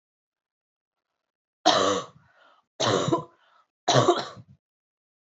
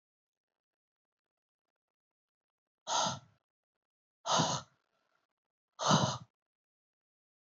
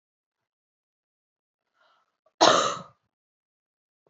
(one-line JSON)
{"three_cough_length": "5.3 s", "three_cough_amplitude": 22969, "three_cough_signal_mean_std_ratio": 0.36, "exhalation_length": "7.4 s", "exhalation_amplitude": 6267, "exhalation_signal_mean_std_ratio": 0.28, "cough_length": "4.1 s", "cough_amplitude": 25484, "cough_signal_mean_std_ratio": 0.21, "survey_phase": "beta (2021-08-13 to 2022-03-07)", "age": "18-44", "gender": "Female", "wearing_mask": "No", "symptom_cough_any": true, "symptom_runny_or_blocked_nose": true, "symptom_fatigue": true, "symptom_onset": "10 days", "smoker_status": "Never smoked", "respiratory_condition_asthma": false, "respiratory_condition_other": false, "recruitment_source": "REACT", "submission_delay": "2 days", "covid_test_result": "Negative", "covid_test_method": "RT-qPCR", "influenza_a_test_result": "Negative", "influenza_b_test_result": "Negative"}